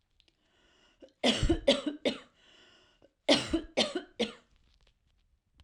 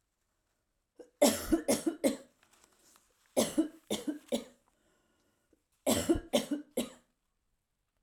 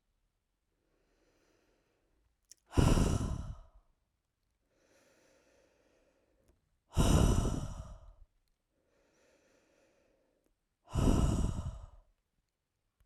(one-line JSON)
{"cough_length": "5.6 s", "cough_amplitude": 11494, "cough_signal_mean_std_ratio": 0.36, "three_cough_length": "8.0 s", "three_cough_amplitude": 9623, "three_cough_signal_mean_std_ratio": 0.36, "exhalation_length": "13.1 s", "exhalation_amplitude": 7130, "exhalation_signal_mean_std_ratio": 0.33, "survey_phase": "alpha (2021-03-01 to 2021-08-12)", "age": "18-44", "gender": "Female", "wearing_mask": "No", "symptom_none": true, "smoker_status": "Ex-smoker", "respiratory_condition_asthma": false, "respiratory_condition_other": false, "recruitment_source": "REACT", "submission_delay": "2 days", "covid_test_result": "Negative", "covid_test_method": "RT-qPCR"}